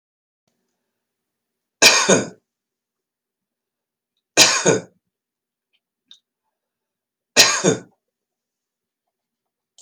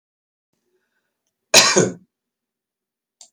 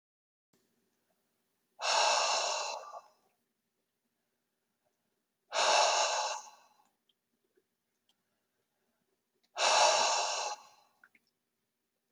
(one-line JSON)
{"three_cough_length": "9.8 s", "three_cough_amplitude": 32767, "three_cough_signal_mean_std_ratio": 0.26, "cough_length": "3.3 s", "cough_amplitude": 32768, "cough_signal_mean_std_ratio": 0.24, "exhalation_length": "12.1 s", "exhalation_amplitude": 7104, "exhalation_signal_mean_std_ratio": 0.39, "survey_phase": "beta (2021-08-13 to 2022-03-07)", "age": "65+", "gender": "Male", "wearing_mask": "No", "symptom_none": true, "smoker_status": "Ex-smoker", "respiratory_condition_asthma": true, "respiratory_condition_other": false, "recruitment_source": "REACT", "submission_delay": "1 day", "covid_test_result": "Negative", "covid_test_method": "RT-qPCR"}